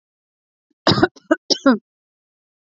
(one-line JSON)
{"cough_length": "2.6 s", "cough_amplitude": 28623, "cough_signal_mean_std_ratio": 0.3, "survey_phase": "beta (2021-08-13 to 2022-03-07)", "age": "18-44", "gender": "Female", "wearing_mask": "No", "symptom_runny_or_blocked_nose": true, "symptom_sore_throat": true, "symptom_fatigue": true, "symptom_change_to_sense_of_smell_or_taste": true, "symptom_other": true, "smoker_status": "Never smoked", "respiratory_condition_asthma": false, "respiratory_condition_other": false, "recruitment_source": "Test and Trace", "submission_delay": "2 days", "covid_test_result": "Positive", "covid_test_method": "RT-qPCR", "covid_ct_value": 22.2, "covid_ct_gene": "ORF1ab gene", "covid_ct_mean": 23.0, "covid_viral_load": "28000 copies/ml", "covid_viral_load_category": "Low viral load (10K-1M copies/ml)"}